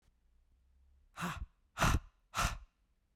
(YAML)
exhalation_length: 3.2 s
exhalation_amplitude: 4473
exhalation_signal_mean_std_ratio: 0.36
survey_phase: beta (2021-08-13 to 2022-03-07)
age: 45-64
gender: Female
wearing_mask: 'No'
symptom_runny_or_blocked_nose: true
symptom_sore_throat: true
symptom_diarrhoea: true
symptom_fatigue: true
symptom_other: true
smoker_status: Never smoked
respiratory_condition_asthma: false
respiratory_condition_other: false
recruitment_source: Test and Trace
submission_delay: 2 days
covid_test_result: Positive
covid_test_method: RT-qPCR
covid_ct_value: 26.8
covid_ct_gene: ORF1ab gene
covid_ct_mean: 27.8
covid_viral_load: 750 copies/ml
covid_viral_load_category: Minimal viral load (< 10K copies/ml)